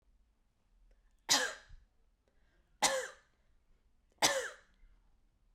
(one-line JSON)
{"three_cough_length": "5.5 s", "three_cough_amplitude": 7252, "three_cough_signal_mean_std_ratio": 0.29, "survey_phase": "beta (2021-08-13 to 2022-03-07)", "age": "18-44", "gender": "Female", "wearing_mask": "No", "symptom_cough_any": true, "symptom_sore_throat": true, "symptom_fatigue": true, "symptom_headache": true, "smoker_status": "Never smoked", "respiratory_condition_asthma": false, "respiratory_condition_other": false, "recruitment_source": "Test and Trace", "submission_delay": "1 day", "covid_test_result": "Positive", "covid_test_method": "LFT"}